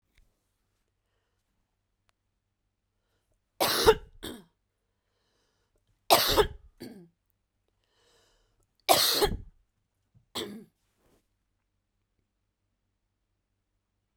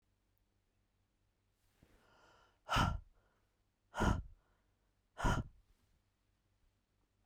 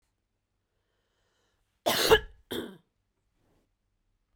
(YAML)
three_cough_length: 14.2 s
three_cough_amplitude: 19421
three_cough_signal_mean_std_ratio: 0.23
exhalation_length: 7.3 s
exhalation_amplitude: 2953
exhalation_signal_mean_std_ratio: 0.27
cough_length: 4.4 s
cough_amplitude: 16045
cough_signal_mean_std_ratio: 0.23
survey_phase: beta (2021-08-13 to 2022-03-07)
age: 45-64
gender: Female
wearing_mask: 'No'
symptom_none: true
smoker_status: Never smoked
respiratory_condition_asthma: false
respiratory_condition_other: false
recruitment_source: REACT
submission_delay: 3 days
covid_test_result: Negative
covid_test_method: RT-qPCR